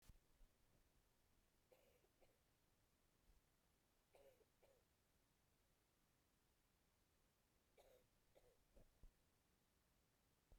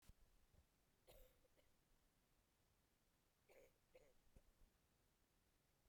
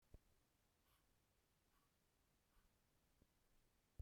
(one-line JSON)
{"three_cough_length": "10.6 s", "three_cough_amplitude": 77, "three_cough_signal_mean_std_ratio": 0.71, "cough_length": "5.9 s", "cough_amplitude": 77, "cough_signal_mean_std_ratio": 0.73, "exhalation_length": "4.0 s", "exhalation_amplitude": 194, "exhalation_signal_mean_std_ratio": 0.33, "survey_phase": "beta (2021-08-13 to 2022-03-07)", "age": "18-44", "gender": "Female", "wearing_mask": "No", "symptom_cough_any": true, "symptom_new_continuous_cough": true, "symptom_runny_or_blocked_nose": true, "symptom_shortness_of_breath": true, "symptom_sore_throat": true, "symptom_fatigue": true, "symptom_onset": "9 days", "smoker_status": "Never smoked", "respiratory_condition_asthma": false, "respiratory_condition_other": false, "recruitment_source": "Test and Trace", "submission_delay": "2 days", "covid_test_result": "Positive", "covid_test_method": "RT-qPCR", "covid_ct_value": 27.3, "covid_ct_gene": "ORF1ab gene", "covid_ct_mean": 28.2, "covid_viral_load": "560 copies/ml", "covid_viral_load_category": "Minimal viral load (< 10K copies/ml)"}